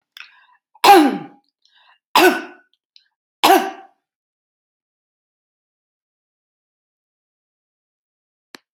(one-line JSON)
{"three_cough_length": "8.7 s", "three_cough_amplitude": 31296, "three_cough_signal_mean_std_ratio": 0.24, "survey_phase": "alpha (2021-03-01 to 2021-08-12)", "age": "65+", "gender": "Female", "wearing_mask": "No", "symptom_none": true, "smoker_status": "Never smoked", "respiratory_condition_asthma": false, "respiratory_condition_other": false, "recruitment_source": "REACT", "submission_delay": "1 day", "covid_test_result": "Negative", "covid_test_method": "RT-qPCR"}